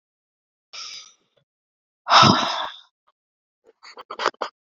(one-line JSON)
{"exhalation_length": "4.7 s", "exhalation_amplitude": 29344, "exhalation_signal_mean_std_ratio": 0.29, "survey_phase": "beta (2021-08-13 to 2022-03-07)", "age": "18-44", "gender": "Female", "wearing_mask": "No", "symptom_new_continuous_cough": true, "symptom_runny_or_blocked_nose": true, "symptom_sore_throat": true, "symptom_fatigue": true, "symptom_fever_high_temperature": true, "symptom_headache": true, "smoker_status": "Never smoked", "respiratory_condition_asthma": false, "respiratory_condition_other": false, "recruitment_source": "Test and Trace", "submission_delay": "2 days", "covid_test_result": "Positive", "covid_test_method": "RT-qPCR", "covid_ct_value": 15.3, "covid_ct_gene": "ORF1ab gene", "covid_ct_mean": 15.6, "covid_viral_load": "7800000 copies/ml", "covid_viral_load_category": "High viral load (>1M copies/ml)"}